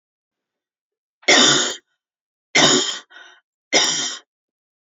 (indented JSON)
{
  "three_cough_length": "4.9 s",
  "three_cough_amplitude": 29058,
  "three_cough_signal_mean_std_ratio": 0.39,
  "survey_phase": "alpha (2021-03-01 to 2021-08-12)",
  "age": "45-64",
  "gender": "Female",
  "wearing_mask": "No",
  "symptom_none": true,
  "smoker_status": "Ex-smoker",
  "respiratory_condition_asthma": false,
  "respiratory_condition_other": false,
  "recruitment_source": "REACT",
  "submission_delay": "7 days",
  "covid_test_result": "Negative",
  "covid_test_method": "RT-qPCR"
}